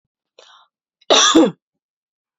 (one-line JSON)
{"cough_length": "2.4 s", "cough_amplitude": 31004, "cough_signal_mean_std_ratio": 0.34, "survey_phase": "beta (2021-08-13 to 2022-03-07)", "age": "18-44", "gender": "Female", "wearing_mask": "No", "symptom_none": true, "smoker_status": "Never smoked", "respiratory_condition_asthma": false, "respiratory_condition_other": false, "recruitment_source": "REACT", "submission_delay": "6 days", "covid_test_result": "Negative", "covid_test_method": "RT-qPCR"}